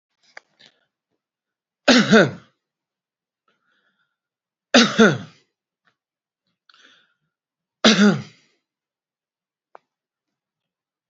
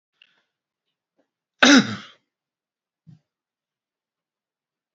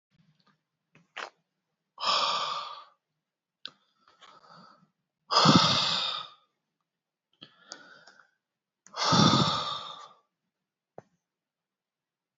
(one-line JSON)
{"three_cough_length": "11.1 s", "three_cough_amplitude": 32682, "three_cough_signal_mean_std_ratio": 0.24, "cough_length": "4.9 s", "cough_amplitude": 32767, "cough_signal_mean_std_ratio": 0.18, "exhalation_length": "12.4 s", "exhalation_amplitude": 17382, "exhalation_signal_mean_std_ratio": 0.34, "survey_phase": "beta (2021-08-13 to 2022-03-07)", "age": "45-64", "gender": "Male", "wearing_mask": "No", "symptom_runny_or_blocked_nose": true, "symptom_fatigue": true, "smoker_status": "Current smoker (11 or more cigarettes per day)", "respiratory_condition_asthma": false, "respiratory_condition_other": false, "recruitment_source": "REACT", "submission_delay": "1 day", "covid_test_result": "Negative", "covid_test_method": "RT-qPCR"}